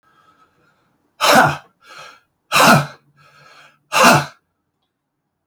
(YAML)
exhalation_length: 5.5 s
exhalation_amplitude: 32158
exhalation_signal_mean_std_ratio: 0.35
survey_phase: beta (2021-08-13 to 2022-03-07)
age: 45-64
gender: Male
wearing_mask: 'No'
symptom_cough_any: true
symptom_fever_high_temperature: true
symptom_onset: 3 days
smoker_status: Ex-smoker
respiratory_condition_asthma: false
respiratory_condition_other: false
recruitment_source: Test and Trace
submission_delay: 1 day
covid_test_result: Positive
covid_test_method: RT-qPCR
covid_ct_value: 17.1
covid_ct_gene: ORF1ab gene
covid_ct_mean: 18.4
covid_viral_load: 910000 copies/ml
covid_viral_load_category: Low viral load (10K-1M copies/ml)